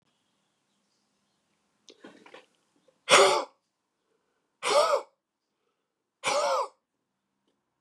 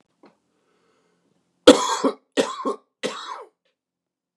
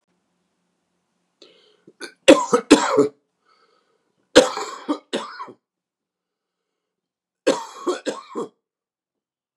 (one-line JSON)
{"exhalation_length": "7.8 s", "exhalation_amplitude": 19893, "exhalation_signal_mean_std_ratio": 0.29, "cough_length": "4.4 s", "cough_amplitude": 32768, "cough_signal_mean_std_ratio": 0.25, "three_cough_length": "9.6 s", "three_cough_amplitude": 32768, "three_cough_signal_mean_std_ratio": 0.26, "survey_phase": "beta (2021-08-13 to 2022-03-07)", "age": "65+", "gender": "Male", "wearing_mask": "No", "symptom_cough_any": true, "symptom_sore_throat": true, "symptom_fatigue": true, "symptom_onset": "2 days", "smoker_status": "Ex-smoker", "respiratory_condition_asthma": false, "respiratory_condition_other": false, "recruitment_source": "Test and Trace", "submission_delay": "1 day", "covid_test_result": "Positive", "covid_test_method": "RT-qPCR", "covid_ct_value": 13.9, "covid_ct_gene": "ORF1ab gene"}